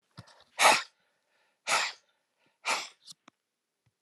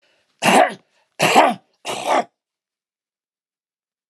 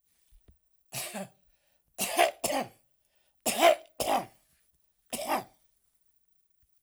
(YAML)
exhalation_length: 4.0 s
exhalation_amplitude: 14100
exhalation_signal_mean_std_ratio: 0.29
cough_length: 4.1 s
cough_amplitude: 29204
cough_signal_mean_std_ratio: 0.36
three_cough_length: 6.8 s
three_cough_amplitude: 12027
three_cough_signal_mean_std_ratio: 0.34
survey_phase: alpha (2021-03-01 to 2021-08-12)
age: 65+
gender: Male
wearing_mask: 'No'
symptom_none: true
smoker_status: Ex-smoker
respiratory_condition_asthma: false
respiratory_condition_other: false
recruitment_source: REACT
submission_delay: 1 day
covid_test_result: Negative
covid_test_method: RT-qPCR